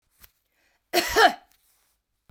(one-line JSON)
{"cough_length": "2.3 s", "cough_amplitude": 18694, "cough_signal_mean_std_ratio": 0.29, "survey_phase": "beta (2021-08-13 to 2022-03-07)", "age": "65+", "gender": "Female", "wearing_mask": "No", "symptom_cough_any": true, "smoker_status": "Ex-smoker", "respiratory_condition_asthma": false, "respiratory_condition_other": true, "recruitment_source": "Test and Trace", "submission_delay": "1 day", "covid_test_result": "Positive", "covid_test_method": "RT-qPCR", "covid_ct_value": 16.8, "covid_ct_gene": "ORF1ab gene", "covid_ct_mean": 16.9, "covid_viral_load": "2900000 copies/ml", "covid_viral_load_category": "High viral load (>1M copies/ml)"}